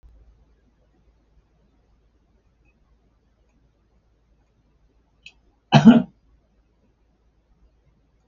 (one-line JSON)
{"cough_length": "8.3 s", "cough_amplitude": 32766, "cough_signal_mean_std_ratio": 0.15, "survey_phase": "beta (2021-08-13 to 2022-03-07)", "age": "65+", "gender": "Male", "wearing_mask": "No", "symptom_diarrhoea": true, "smoker_status": "Ex-smoker", "respiratory_condition_asthma": false, "respiratory_condition_other": false, "recruitment_source": "REACT", "submission_delay": "2 days", "covid_test_result": "Negative", "covid_test_method": "RT-qPCR", "influenza_a_test_result": "Negative", "influenza_b_test_result": "Negative"}